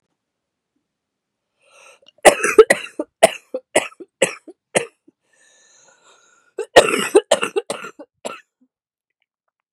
{
  "cough_length": "9.7 s",
  "cough_amplitude": 32768,
  "cough_signal_mean_std_ratio": 0.25,
  "survey_phase": "beta (2021-08-13 to 2022-03-07)",
  "age": "18-44",
  "gender": "Female",
  "wearing_mask": "No",
  "symptom_cough_any": true,
  "symptom_runny_or_blocked_nose": true,
  "symptom_fatigue": true,
  "symptom_fever_high_temperature": true,
  "symptom_headache": true,
  "symptom_change_to_sense_of_smell_or_taste": true,
  "symptom_other": true,
  "smoker_status": "Never smoked",
  "respiratory_condition_asthma": false,
  "respiratory_condition_other": false,
  "recruitment_source": "Test and Trace",
  "submission_delay": "1 day",
  "covid_test_result": "Positive",
  "covid_test_method": "RT-qPCR",
  "covid_ct_value": 29.0,
  "covid_ct_gene": "ORF1ab gene",
  "covid_ct_mean": 29.5,
  "covid_viral_load": "210 copies/ml",
  "covid_viral_load_category": "Minimal viral load (< 10K copies/ml)"
}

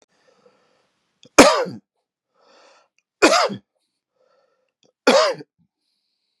{
  "three_cough_length": "6.4 s",
  "three_cough_amplitude": 32768,
  "three_cough_signal_mean_std_ratio": 0.27,
  "survey_phase": "beta (2021-08-13 to 2022-03-07)",
  "age": "45-64",
  "gender": "Male",
  "wearing_mask": "No",
  "symptom_cough_any": true,
  "symptom_new_continuous_cough": true,
  "symptom_sore_throat": true,
  "symptom_fatigue": true,
  "symptom_other": true,
  "smoker_status": "Never smoked",
  "respiratory_condition_asthma": false,
  "respiratory_condition_other": false,
  "recruitment_source": "Test and Trace",
  "submission_delay": "1 day",
  "covid_test_result": "Positive",
  "covid_test_method": "LFT"
}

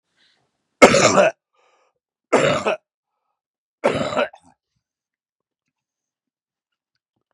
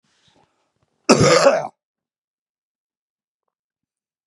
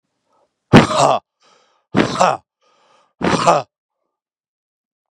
{
  "three_cough_length": "7.3 s",
  "three_cough_amplitude": 32768,
  "three_cough_signal_mean_std_ratio": 0.29,
  "cough_length": "4.3 s",
  "cough_amplitude": 32767,
  "cough_signal_mean_std_ratio": 0.27,
  "exhalation_length": "5.1 s",
  "exhalation_amplitude": 32768,
  "exhalation_signal_mean_std_ratio": 0.34,
  "survey_phase": "beta (2021-08-13 to 2022-03-07)",
  "age": "45-64",
  "gender": "Male",
  "wearing_mask": "No",
  "symptom_cough_any": true,
  "symptom_runny_or_blocked_nose": true,
  "symptom_fatigue": true,
  "symptom_onset": "3 days",
  "smoker_status": "Never smoked",
  "respiratory_condition_asthma": true,
  "respiratory_condition_other": false,
  "recruitment_source": "Test and Trace",
  "submission_delay": "1 day",
  "covid_test_result": "Positive",
  "covid_test_method": "RT-qPCR",
  "covid_ct_value": 22.7,
  "covid_ct_gene": "ORF1ab gene"
}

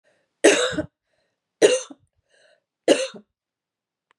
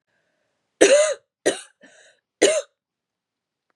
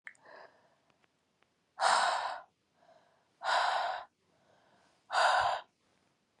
{
  "three_cough_length": "4.2 s",
  "three_cough_amplitude": 28126,
  "three_cough_signal_mean_std_ratio": 0.3,
  "cough_length": "3.8 s",
  "cough_amplitude": 32767,
  "cough_signal_mean_std_ratio": 0.32,
  "exhalation_length": "6.4 s",
  "exhalation_amplitude": 5716,
  "exhalation_signal_mean_std_ratio": 0.42,
  "survey_phase": "beta (2021-08-13 to 2022-03-07)",
  "age": "45-64",
  "gender": "Female",
  "wearing_mask": "No",
  "symptom_runny_or_blocked_nose": true,
  "symptom_headache": true,
  "smoker_status": "Never smoked",
  "respiratory_condition_asthma": false,
  "respiratory_condition_other": false,
  "recruitment_source": "Test and Trace",
  "submission_delay": "2 days",
  "covid_test_result": "Positive",
  "covid_test_method": "RT-qPCR",
  "covid_ct_value": 20.4,
  "covid_ct_gene": "ORF1ab gene"
}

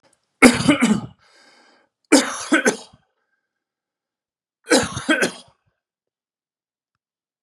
{
  "three_cough_length": "7.4 s",
  "three_cough_amplitude": 32768,
  "three_cough_signal_mean_std_ratio": 0.32,
  "survey_phase": "beta (2021-08-13 to 2022-03-07)",
  "age": "45-64",
  "gender": "Male",
  "wearing_mask": "No",
  "symptom_none": true,
  "smoker_status": "Never smoked",
  "respiratory_condition_asthma": false,
  "respiratory_condition_other": false,
  "recruitment_source": "REACT",
  "submission_delay": "2 days",
  "covid_test_method": "RT-qPCR",
  "influenza_a_test_result": "Unknown/Void",
  "influenza_b_test_result": "Unknown/Void"
}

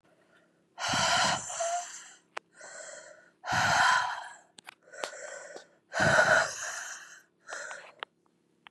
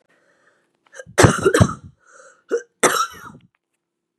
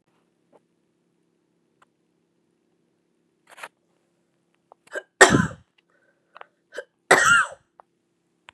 {
  "exhalation_length": "8.7 s",
  "exhalation_amplitude": 10287,
  "exhalation_signal_mean_std_ratio": 0.49,
  "three_cough_length": "4.2 s",
  "three_cough_amplitude": 32768,
  "three_cough_signal_mean_std_ratio": 0.33,
  "cough_length": "8.5 s",
  "cough_amplitude": 32767,
  "cough_signal_mean_std_ratio": 0.21,
  "survey_phase": "beta (2021-08-13 to 2022-03-07)",
  "age": "18-44",
  "gender": "Female",
  "wearing_mask": "No",
  "symptom_runny_or_blocked_nose": true,
  "symptom_abdominal_pain": true,
  "symptom_fatigue": true,
  "symptom_headache": true,
  "symptom_change_to_sense_of_smell_or_taste": true,
  "symptom_onset": "4 days",
  "smoker_status": "Never smoked",
  "respiratory_condition_asthma": false,
  "respiratory_condition_other": false,
  "recruitment_source": "Test and Trace",
  "submission_delay": "2 days",
  "covid_test_result": "Positive",
  "covid_test_method": "RT-qPCR",
  "covid_ct_value": 26.5,
  "covid_ct_gene": "ORF1ab gene"
}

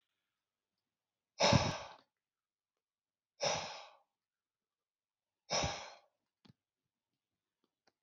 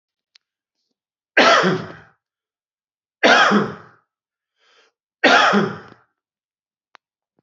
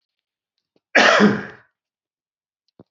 {
  "exhalation_length": "8.0 s",
  "exhalation_amplitude": 5862,
  "exhalation_signal_mean_std_ratio": 0.25,
  "three_cough_length": "7.4 s",
  "three_cough_amplitude": 29625,
  "three_cough_signal_mean_std_ratio": 0.35,
  "cough_length": "2.9 s",
  "cough_amplitude": 32113,
  "cough_signal_mean_std_ratio": 0.32,
  "survey_phase": "beta (2021-08-13 to 2022-03-07)",
  "age": "45-64",
  "gender": "Male",
  "wearing_mask": "No",
  "symptom_cough_any": true,
  "symptom_other": true,
  "smoker_status": "Never smoked",
  "respiratory_condition_asthma": true,
  "respiratory_condition_other": false,
  "recruitment_source": "Test and Trace",
  "submission_delay": "2 days",
  "covid_test_result": "Positive",
  "covid_test_method": "RT-qPCR",
  "covid_ct_value": 23.3,
  "covid_ct_gene": "N gene"
}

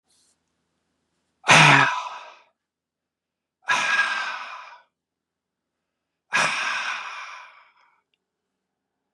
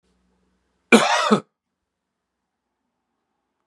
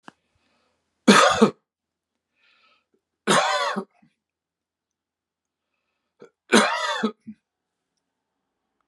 {
  "exhalation_length": "9.1 s",
  "exhalation_amplitude": 28847,
  "exhalation_signal_mean_std_ratio": 0.33,
  "cough_length": "3.7 s",
  "cough_amplitude": 32740,
  "cough_signal_mean_std_ratio": 0.25,
  "three_cough_length": "8.9 s",
  "three_cough_amplitude": 29956,
  "three_cough_signal_mean_std_ratio": 0.29,
  "survey_phase": "beta (2021-08-13 to 2022-03-07)",
  "age": "65+",
  "gender": "Male",
  "wearing_mask": "No",
  "symptom_none": true,
  "smoker_status": "Never smoked",
  "respiratory_condition_asthma": false,
  "respiratory_condition_other": false,
  "recruitment_source": "REACT",
  "submission_delay": "3 days",
  "covid_test_result": "Negative",
  "covid_test_method": "RT-qPCR",
  "influenza_a_test_result": "Negative",
  "influenza_b_test_result": "Negative"
}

